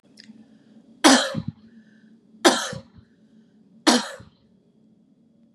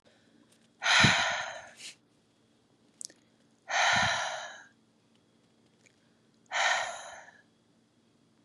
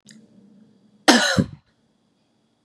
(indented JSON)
{
  "three_cough_length": "5.5 s",
  "three_cough_amplitude": 31695,
  "three_cough_signal_mean_std_ratio": 0.29,
  "exhalation_length": "8.4 s",
  "exhalation_amplitude": 11522,
  "exhalation_signal_mean_std_ratio": 0.38,
  "cough_length": "2.6 s",
  "cough_amplitude": 32072,
  "cough_signal_mean_std_ratio": 0.28,
  "survey_phase": "beta (2021-08-13 to 2022-03-07)",
  "age": "18-44",
  "gender": "Female",
  "wearing_mask": "No",
  "symptom_fatigue": true,
  "symptom_other": true,
  "symptom_onset": "2 days",
  "smoker_status": "Never smoked",
  "respiratory_condition_asthma": false,
  "respiratory_condition_other": false,
  "recruitment_source": "Test and Trace",
  "submission_delay": "2 days",
  "covid_test_result": "Positive",
  "covid_test_method": "RT-qPCR",
  "covid_ct_value": 27.8,
  "covid_ct_gene": "ORF1ab gene",
  "covid_ct_mean": 27.8,
  "covid_viral_load": "740 copies/ml",
  "covid_viral_load_category": "Minimal viral load (< 10K copies/ml)"
}